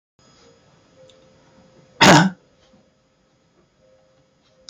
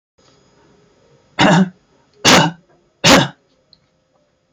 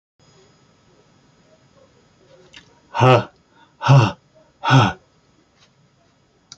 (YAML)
cough_length: 4.7 s
cough_amplitude: 30114
cough_signal_mean_std_ratio: 0.21
three_cough_length: 4.5 s
three_cough_amplitude: 32767
three_cough_signal_mean_std_ratio: 0.35
exhalation_length: 6.6 s
exhalation_amplitude: 29008
exhalation_signal_mean_std_ratio: 0.29
survey_phase: beta (2021-08-13 to 2022-03-07)
age: 65+
gender: Male
wearing_mask: 'No'
symptom_none: true
smoker_status: Never smoked
respiratory_condition_asthma: false
respiratory_condition_other: false
recruitment_source: REACT
submission_delay: 1 day
covid_test_result: Negative
covid_test_method: RT-qPCR
influenza_a_test_result: Negative
influenza_b_test_result: Negative